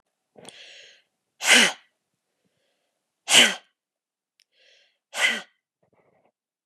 {"exhalation_length": "6.7 s", "exhalation_amplitude": 29362, "exhalation_signal_mean_std_ratio": 0.25, "survey_phase": "beta (2021-08-13 to 2022-03-07)", "age": "45-64", "gender": "Female", "wearing_mask": "No", "symptom_cough_any": true, "symptom_onset": "13 days", "smoker_status": "Never smoked", "respiratory_condition_asthma": false, "respiratory_condition_other": false, "recruitment_source": "REACT", "submission_delay": "0 days", "covid_test_result": "Negative", "covid_test_method": "RT-qPCR", "influenza_a_test_result": "Negative", "influenza_b_test_result": "Negative"}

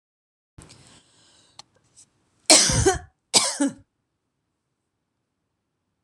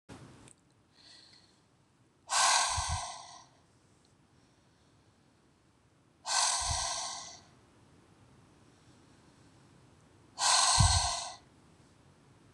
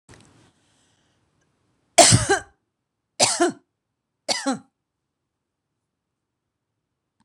{"cough_length": "6.0 s", "cough_amplitude": 26028, "cough_signal_mean_std_ratio": 0.27, "exhalation_length": "12.5 s", "exhalation_amplitude": 7808, "exhalation_signal_mean_std_ratio": 0.38, "three_cough_length": "7.2 s", "three_cough_amplitude": 26028, "three_cough_signal_mean_std_ratio": 0.25, "survey_phase": "beta (2021-08-13 to 2022-03-07)", "age": "45-64", "gender": "Female", "wearing_mask": "No", "symptom_none": true, "smoker_status": "Ex-smoker", "respiratory_condition_asthma": false, "respiratory_condition_other": false, "recruitment_source": "REACT", "submission_delay": "4 days", "covid_test_result": "Negative", "covid_test_method": "RT-qPCR", "influenza_a_test_result": "Negative", "influenza_b_test_result": "Negative"}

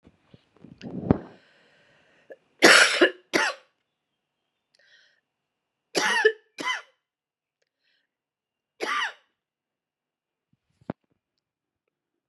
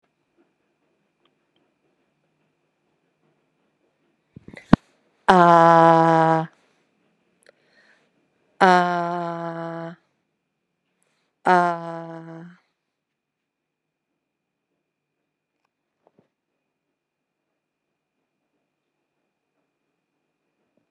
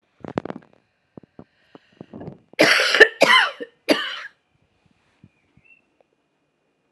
{"three_cough_length": "12.3 s", "three_cough_amplitude": 29137, "three_cough_signal_mean_std_ratio": 0.25, "exhalation_length": "20.9 s", "exhalation_amplitude": 32768, "exhalation_signal_mean_std_ratio": 0.21, "cough_length": "6.9 s", "cough_amplitude": 32768, "cough_signal_mean_std_ratio": 0.29, "survey_phase": "alpha (2021-03-01 to 2021-08-12)", "age": "45-64", "gender": "Female", "wearing_mask": "Yes", "symptom_cough_any": true, "symptom_shortness_of_breath": true, "symptom_diarrhoea": true, "symptom_fatigue": true, "symptom_fever_high_temperature": true, "symptom_headache": true, "symptom_change_to_sense_of_smell_or_taste": true, "symptom_onset": "4 days", "smoker_status": "Never smoked", "respiratory_condition_asthma": false, "respiratory_condition_other": false, "recruitment_source": "Test and Trace", "submission_delay": "2 days", "covid_test_result": "Positive", "covid_test_method": "RT-qPCR", "covid_ct_value": 18.0, "covid_ct_gene": "ORF1ab gene", "covid_ct_mean": 18.1, "covid_viral_load": "1100000 copies/ml", "covid_viral_load_category": "High viral load (>1M copies/ml)"}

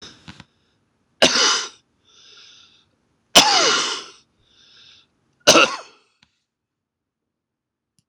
{"three_cough_length": "8.1 s", "three_cough_amplitude": 26028, "three_cough_signal_mean_std_ratio": 0.3, "survey_phase": "beta (2021-08-13 to 2022-03-07)", "age": "65+", "gender": "Male", "wearing_mask": "No", "symptom_cough_any": true, "symptom_runny_or_blocked_nose": true, "symptom_shortness_of_breath": true, "symptom_fatigue": true, "symptom_loss_of_taste": true, "smoker_status": "Never smoked", "respiratory_condition_asthma": true, "respiratory_condition_other": false, "recruitment_source": "REACT", "submission_delay": "1 day", "covid_test_result": "Negative", "covid_test_method": "RT-qPCR", "influenza_a_test_result": "Negative", "influenza_b_test_result": "Negative"}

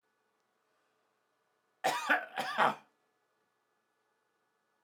{"cough_length": "4.8 s", "cough_amplitude": 7290, "cough_signal_mean_std_ratio": 0.28, "survey_phase": "alpha (2021-03-01 to 2021-08-12)", "age": "65+", "gender": "Male", "wearing_mask": "No", "symptom_none": true, "smoker_status": "Ex-smoker", "respiratory_condition_asthma": false, "respiratory_condition_other": false, "recruitment_source": "REACT", "submission_delay": "2 days", "covid_test_result": "Negative", "covid_test_method": "RT-qPCR"}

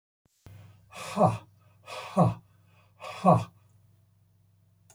{"exhalation_length": "4.9 s", "exhalation_amplitude": 15141, "exhalation_signal_mean_std_ratio": 0.31, "survey_phase": "alpha (2021-03-01 to 2021-08-12)", "age": "65+", "gender": "Male", "wearing_mask": "No", "symptom_none": true, "smoker_status": "Never smoked", "respiratory_condition_asthma": false, "respiratory_condition_other": false, "recruitment_source": "REACT", "submission_delay": "1 day", "covid_test_result": "Negative", "covid_test_method": "RT-qPCR"}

